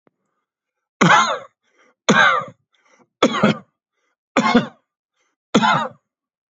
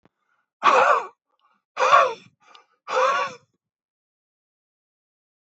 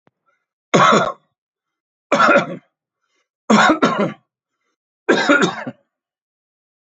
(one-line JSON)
{"cough_length": "6.6 s", "cough_amplitude": 32767, "cough_signal_mean_std_ratio": 0.39, "exhalation_length": "5.5 s", "exhalation_amplitude": 25294, "exhalation_signal_mean_std_ratio": 0.36, "three_cough_length": "6.8 s", "three_cough_amplitude": 30236, "three_cough_signal_mean_std_ratio": 0.41, "survey_phase": "beta (2021-08-13 to 2022-03-07)", "age": "45-64", "gender": "Male", "wearing_mask": "No", "symptom_cough_any": true, "symptom_runny_or_blocked_nose": true, "symptom_fatigue": true, "symptom_headache": true, "symptom_onset": "3 days", "smoker_status": "Ex-smoker", "respiratory_condition_asthma": false, "respiratory_condition_other": false, "recruitment_source": "Test and Trace", "submission_delay": "2 days", "covid_test_result": "Positive", "covid_test_method": "RT-qPCR", "covid_ct_value": 19.9, "covid_ct_gene": "ORF1ab gene", "covid_ct_mean": 20.0, "covid_viral_load": "270000 copies/ml", "covid_viral_load_category": "Low viral load (10K-1M copies/ml)"}